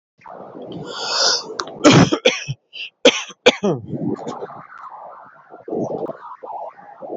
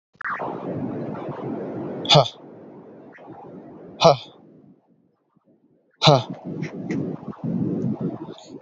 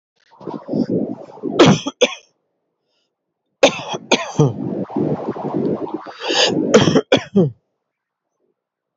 {
  "cough_length": "7.2 s",
  "cough_amplitude": 29940,
  "cough_signal_mean_std_ratio": 0.45,
  "exhalation_length": "8.6 s",
  "exhalation_amplitude": 27664,
  "exhalation_signal_mean_std_ratio": 0.45,
  "three_cough_length": "9.0 s",
  "three_cough_amplitude": 32508,
  "three_cough_signal_mean_std_ratio": 0.48,
  "survey_phase": "alpha (2021-03-01 to 2021-08-12)",
  "age": "18-44",
  "gender": "Male",
  "wearing_mask": "No",
  "symptom_cough_any": true,
  "symptom_fatigue": true,
  "smoker_status": "Never smoked",
  "respiratory_condition_asthma": false,
  "respiratory_condition_other": false,
  "recruitment_source": "Test and Trace",
  "submission_delay": "2 days",
  "covid_test_result": "Positive",
  "covid_test_method": "RT-qPCR",
  "covid_ct_value": 22.9,
  "covid_ct_gene": "ORF1ab gene"
}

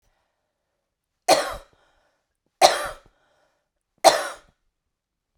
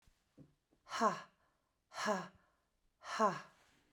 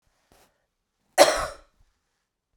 {
  "three_cough_length": "5.4 s",
  "three_cough_amplitude": 32768,
  "three_cough_signal_mean_std_ratio": 0.24,
  "exhalation_length": "3.9 s",
  "exhalation_amplitude": 3704,
  "exhalation_signal_mean_std_ratio": 0.35,
  "cough_length": "2.6 s",
  "cough_amplitude": 32767,
  "cough_signal_mean_std_ratio": 0.22,
  "survey_phase": "beta (2021-08-13 to 2022-03-07)",
  "age": "45-64",
  "gender": "Female",
  "wearing_mask": "No",
  "symptom_none": true,
  "smoker_status": "Never smoked",
  "respiratory_condition_asthma": false,
  "respiratory_condition_other": false,
  "recruitment_source": "REACT",
  "submission_delay": "2 days",
  "covid_test_result": "Negative",
  "covid_test_method": "RT-qPCR"
}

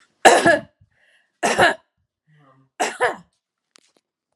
{
  "three_cough_length": "4.4 s",
  "three_cough_amplitude": 32768,
  "three_cough_signal_mean_std_ratio": 0.33,
  "survey_phase": "alpha (2021-03-01 to 2021-08-12)",
  "age": "45-64",
  "gender": "Female",
  "wearing_mask": "No",
  "symptom_fatigue": true,
  "smoker_status": "Never smoked",
  "respiratory_condition_asthma": false,
  "respiratory_condition_other": false,
  "recruitment_source": "Test and Trace",
  "submission_delay": "0 days",
  "covid_test_result": "Negative",
  "covid_test_method": "LFT"
}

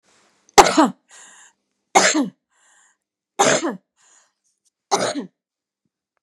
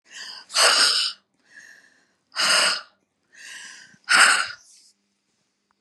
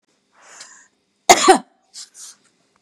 {
  "three_cough_length": "6.2 s",
  "three_cough_amplitude": 32768,
  "three_cough_signal_mean_std_ratio": 0.31,
  "exhalation_length": "5.8 s",
  "exhalation_amplitude": 27346,
  "exhalation_signal_mean_std_ratio": 0.42,
  "cough_length": "2.8 s",
  "cough_amplitude": 32768,
  "cough_signal_mean_std_ratio": 0.24,
  "survey_phase": "beta (2021-08-13 to 2022-03-07)",
  "age": "65+",
  "gender": "Female",
  "wearing_mask": "No",
  "symptom_none": true,
  "smoker_status": "Never smoked",
  "respiratory_condition_asthma": false,
  "respiratory_condition_other": false,
  "recruitment_source": "REACT",
  "submission_delay": "2 days",
  "covid_test_result": "Negative",
  "covid_test_method": "RT-qPCR",
  "influenza_a_test_result": "Negative",
  "influenza_b_test_result": "Negative"
}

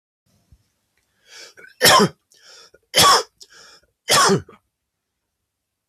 {
  "three_cough_length": "5.9 s",
  "three_cough_amplitude": 32768,
  "three_cough_signal_mean_std_ratio": 0.32,
  "survey_phase": "beta (2021-08-13 to 2022-03-07)",
  "age": "18-44",
  "gender": "Male",
  "wearing_mask": "No",
  "symptom_none": true,
  "smoker_status": "Never smoked",
  "respiratory_condition_asthma": false,
  "respiratory_condition_other": false,
  "recruitment_source": "REACT",
  "submission_delay": "1 day",
  "covid_test_result": "Negative",
  "covid_test_method": "RT-qPCR",
  "influenza_a_test_result": "Negative",
  "influenza_b_test_result": "Negative"
}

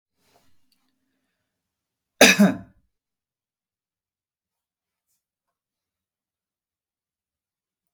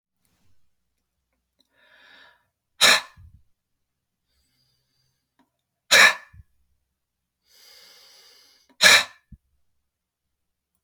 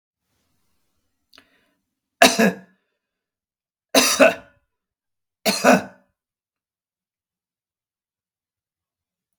{
  "cough_length": "7.9 s",
  "cough_amplitude": 32766,
  "cough_signal_mean_std_ratio": 0.15,
  "exhalation_length": "10.8 s",
  "exhalation_amplitude": 30950,
  "exhalation_signal_mean_std_ratio": 0.2,
  "three_cough_length": "9.4 s",
  "three_cough_amplitude": 32768,
  "three_cough_signal_mean_std_ratio": 0.24,
  "survey_phase": "beta (2021-08-13 to 2022-03-07)",
  "age": "45-64",
  "gender": "Female",
  "wearing_mask": "No",
  "symptom_none": true,
  "smoker_status": "Ex-smoker",
  "respiratory_condition_asthma": false,
  "respiratory_condition_other": false,
  "recruitment_source": "REACT",
  "submission_delay": "5 days",
  "covid_test_result": "Negative",
  "covid_test_method": "RT-qPCR"
}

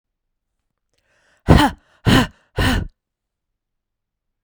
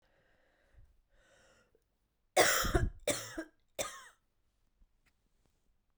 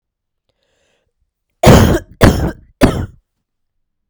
{
  "exhalation_length": "4.4 s",
  "exhalation_amplitude": 32768,
  "exhalation_signal_mean_std_ratio": 0.3,
  "three_cough_length": "6.0 s",
  "three_cough_amplitude": 8468,
  "three_cough_signal_mean_std_ratio": 0.29,
  "cough_length": "4.1 s",
  "cough_amplitude": 32768,
  "cough_signal_mean_std_ratio": 0.36,
  "survey_phase": "beta (2021-08-13 to 2022-03-07)",
  "age": "18-44",
  "gender": "Female",
  "wearing_mask": "No",
  "symptom_cough_any": true,
  "symptom_runny_or_blocked_nose": true,
  "symptom_diarrhoea": true,
  "symptom_headache": true,
  "symptom_onset": "3 days",
  "smoker_status": "Ex-smoker",
  "respiratory_condition_asthma": false,
  "respiratory_condition_other": false,
  "recruitment_source": "Test and Trace",
  "submission_delay": "2 days",
  "covid_test_result": "Positive",
  "covid_test_method": "RT-qPCR",
  "covid_ct_value": 14.1,
  "covid_ct_gene": "ORF1ab gene"
}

